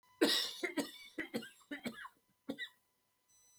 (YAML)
cough_length: 3.6 s
cough_amplitude: 4654
cough_signal_mean_std_ratio: 0.41
survey_phase: beta (2021-08-13 to 2022-03-07)
age: 45-64
gender: Male
wearing_mask: 'No'
symptom_cough_any: true
symptom_new_continuous_cough: true
symptom_onset: 7 days
smoker_status: Ex-smoker
respiratory_condition_asthma: true
respiratory_condition_other: false
recruitment_source: REACT
submission_delay: 1 day
covid_test_result: Negative
covid_test_method: RT-qPCR